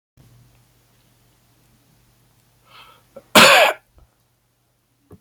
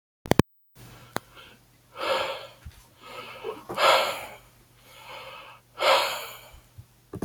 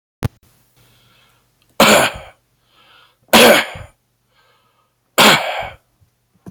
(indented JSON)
{
  "cough_length": "5.2 s",
  "cough_amplitude": 32768,
  "cough_signal_mean_std_ratio": 0.23,
  "exhalation_length": "7.2 s",
  "exhalation_amplitude": 25183,
  "exhalation_signal_mean_std_ratio": 0.37,
  "three_cough_length": "6.5 s",
  "three_cough_amplitude": 32767,
  "three_cough_signal_mean_std_ratio": 0.33,
  "survey_phase": "beta (2021-08-13 to 2022-03-07)",
  "age": "45-64",
  "gender": "Male",
  "wearing_mask": "No",
  "symptom_sore_throat": true,
  "symptom_onset": "3 days",
  "smoker_status": "Current smoker (1 to 10 cigarettes per day)",
  "respiratory_condition_asthma": false,
  "respiratory_condition_other": false,
  "recruitment_source": "REACT",
  "submission_delay": "1 day",
  "covid_test_result": "Negative",
  "covid_test_method": "RT-qPCR",
  "influenza_a_test_result": "Negative",
  "influenza_b_test_result": "Negative"
}